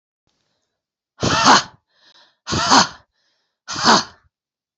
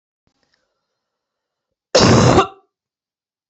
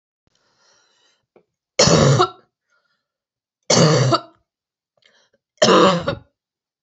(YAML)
exhalation_length: 4.8 s
exhalation_amplitude: 32767
exhalation_signal_mean_std_ratio: 0.36
cough_length: 3.5 s
cough_amplitude: 32767
cough_signal_mean_std_ratio: 0.32
three_cough_length: 6.8 s
three_cough_amplitude: 31066
three_cough_signal_mean_std_ratio: 0.38
survey_phase: beta (2021-08-13 to 2022-03-07)
age: 18-44
gender: Female
wearing_mask: 'No'
symptom_cough_any: true
symptom_runny_or_blocked_nose: true
symptom_sore_throat: true
symptom_fatigue: true
symptom_onset: 2 days
smoker_status: Current smoker (1 to 10 cigarettes per day)
respiratory_condition_asthma: false
respiratory_condition_other: false
recruitment_source: Test and Trace
submission_delay: 1 day
covid_test_result: Positive
covid_test_method: RT-qPCR
covid_ct_value: 23.2
covid_ct_gene: ORF1ab gene